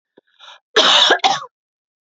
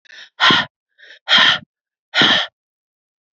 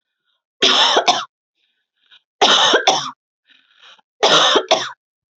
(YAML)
cough_length: 2.1 s
cough_amplitude: 32767
cough_signal_mean_std_ratio: 0.44
exhalation_length: 3.3 s
exhalation_amplitude: 32093
exhalation_signal_mean_std_ratio: 0.42
three_cough_length: 5.4 s
three_cough_amplitude: 32768
three_cough_signal_mean_std_ratio: 0.47
survey_phase: beta (2021-08-13 to 2022-03-07)
age: 18-44
gender: Female
wearing_mask: 'No'
symptom_none: true
smoker_status: Never smoked
respiratory_condition_asthma: false
respiratory_condition_other: false
recruitment_source: REACT
submission_delay: 0 days
covid_test_result: Negative
covid_test_method: RT-qPCR
influenza_a_test_result: Negative
influenza_b_test_result: Negative